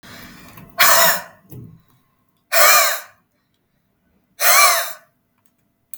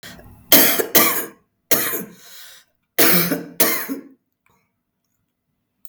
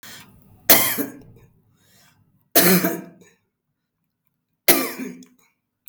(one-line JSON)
{"exhalation_length": "6.0 s", "exhalation_amplitude": 32768, "exhalation_signal_mean_std_ratio": 0.4, "cough_length": "5.9 s", "cough_amplitude": 32768, "cough_signal_mean_std_ratio": 0.42, "three_cough_length": "5.9 s", "three_cough_amplitude": 32768, "three_cough_signal_mean_std_ratio": 0.32, "survey_phase": "beta (2021-08-13 to 2022-03-07)", "age": "45-64", "gender": "Female", "wearing_mask": "No", "symptom_none": true, "smoker_status": "Ex-smoker", "respiratory_condition_asthma": true, "respiratory_condition_other": false, "recruitment_source": "REACT", "submission_delay": "1 day", "covid_test_result": "Negative", "covid_test_method": "RT-qPCR"}